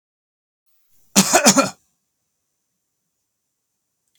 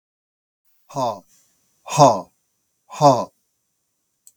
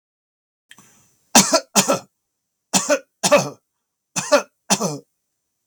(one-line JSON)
{"cough_length": "4.2 s", "cough_amplitude": 32767, "cough_signal_mean_std_ratio": 0.25, "exhalation_length": "4.4 s", "exhalation_amplitude": 32768, "exhalation_signal_mean_std_ratio": 0.28, "three_cough_length": "5.7 s", "three_cough_amplitude": 32386, "three_cough_signal_mean_std_ratio": 0.35, "survey_phase": "beta (2021-08-13 to 2022-03-07)", "age": "65+", "gender": "Male", "wearing_mask": "No", "symptom_none": true, "smoker_status": "Ex-smoker", "respiratory_condition_asthma": false, "respiratory_condition_other": false, "recruitment_source": "REACT", "submission_delay": "2 days", "covid_test_result": "Positive", "covid_test_method": "RT-qPCR", "covid_ct_value": 38.7, "covid_ct_gene": "E gene", "influenza_a_test_result": "Negative", "influenza_b_test_result": "Negative"}